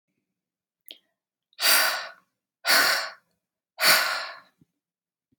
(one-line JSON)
{"exhalation_length": "5.4 s", "exhalation_amplitude": 19324, "exhalation_signal_mean_std_ratio": 0.38, "survey_phase": "beta (2021-08-13 to 2022-03-07)", "age": "45-64", "gender": "Female", "wearing_mask": "No", "symptom_none": true, "smoker_status": "Never smoked", "respiratory_condition_asthma": false, "respiratory_condition_other": false, "recruitment_source": "REACT", "submission_delay": "1 day", "covid_test_result": "Negative", "covid_test_method": "RT-qPCR", "influenza_a_test_result": "Negative", "influenza_b_test_result": "Negative"}